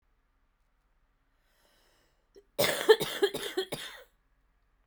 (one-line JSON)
{"cough_length": "4.9 s", "cough_amplitude": 15539, "cough_signal_mean_std_ratio": 0.28, "survey_phase": "beta (2021-08-13 to 2022-03-07)", "age": "18-44", "gender": "Female", "wearing_mask": "No", "symptom_cough_any": true, "symptom_runny_or_blocked_nose": true, "symptom_sore_throat": true, "symptom_abdominal_pain": true, "symptom_diarrhoea": true, "symptom_headache": true, "symptom_other": true, "symptom_onset": "2 days", "smoker_status": "Prefer not to say", "respiratory_condition_asthma": false, "respiratory_condition_other": false, "recruitment_source": "Test and Trace", "submission_delay": "1 day", "covid_test_result": "Positive", "covid_test_method": "RT-qPCR"}